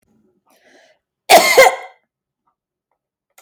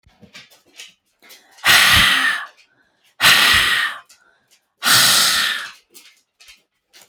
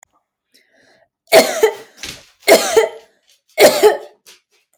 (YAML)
cough_length: 3.4 s
cough_amplitude: 32768
cough_signal_mean_std_ratio: 0.29
exhalation_length: 7.1 s
exhalation_amplitude: 32768
exhalation_signal_mean_std_ratio: 0.48
three_cough_length: 4.8 s
three_cough_amplitude: 32768
three_cough_signal_mean_std_ratio: 0.38
survey_phase: beta (2021-08-13 to 2022-03-07)
age: 18-44
gender: Female
wearing_mask: 'No'
symptom_none: true
smoker_status: Never smoked
respiratory_condition_asthma: false
respiratory_condition_other: false
recruitment_source: REACT
submission_delay: 1 day
covid_test_result: Negative
covid_test_method: RT-qPCR
influenza_a_test_result: Negative
influenza_b_test_result: Negative